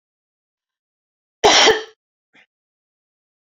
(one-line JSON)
{"cough_length": "3.5 s", "cough_amplitude": 29889, "cough_signal_mean_std_ratio": 0.26, "survey_phase": "beta (2021-08-13 to 2022-03-07)", "age": "65+", "gender": "Female", "wearing_mask": "No", "symptom_none": true, "smoker_status": "Ex-smoker", "respiratory_condition_asthma": false, "respiratory_condition_other": false, "recruitment_source": "REACT", "submission_delay": "2 days", "covid_test_result": "Negative", "covid_test_method": "RT-qPCR"}